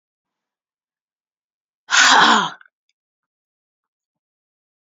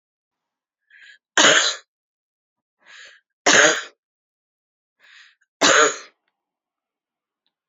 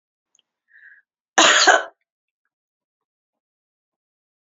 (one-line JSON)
{"exhalation_length": "4.9 s", "exhalation_amplitude": 29410, "exhalation_signal_mean_std_ratio": 0.27, "three_cough_length": "7.7 s", "three_cough_amplitude": 30679, "three_cough_signal_mean_std_ratio": 0.29, "cough_length": "4.4 s", "cough_amplitude": 29602, "cough_signal_mean_std_ratio": 0.25, "survey_phase": "beta (2021-08-13 to 2022-03-07)", "age": "45-64", "gender": "Female", "wearing_mask": "No", "symptom_cough_any": true, "symptom_runny_or_blocked_nose": true, "symptom_sore_throat": true, "symptom_fatigue": true, "symptom_fever_high_temperature": true, "symptom_headache": true, "symptom_change_to_sense_of_smell_or_taste": true, "symptom_loss_of_taste": true, "symptom_onset": "5 days", "smoker_status": "Current smoker (1 to 10 cigarettes per day)", "respiratory_condition_asthma": false, "respiratory_condition_other": false, "recruitment_source": "Test and Trace", "submission_delay": "2 days", "covid_test_result": "Positive", "covid_test_method": "RT-qPCR", "covid_ct_value": 15.8, "covid_ct_gene": "N gene", "covid_ct_mean": 16.8, "covid_viral_load": "3100000 copies/ml", "covid_viral_load_category": "High viral load (>1M copies/ml)"}